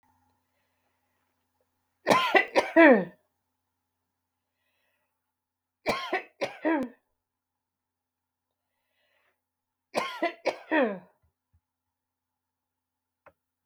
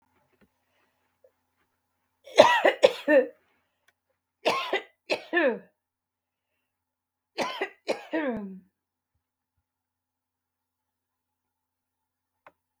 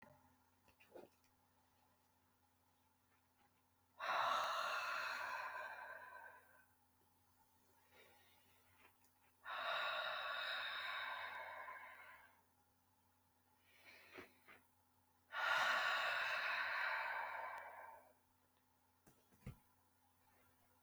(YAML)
three_cough_length: 13.7 s
three_cough_amplitude: 18807
three_cough_signal_mean_std_ratio: 0.25
cough_length: 12.8 s
cough_amplitude: 32163
cough_signal_mean_std_ratio: 0.26
exhalation_length: 20.8 s
exhalation_amplitude: 1454
exhalation_signal_mean_std_ratio: 0.51
survey_phase: beta (2021-08-13 to 2022-03-07)
age: 65+
gender: Female
wearing_mask: 'No'
symptom_runny_or_blocked_nose: true
smoker_status: Never smoked
respiratory_condition_asthma: false
respiratory_condition_other: false
recruitment_source: REACT
submission_delay: 4 days
covid_test_result: Negative
covid_test_method: RT-qPCR
influenza_a_test_result: Unknown/Void
influenza_b_test_result: Unknown/Void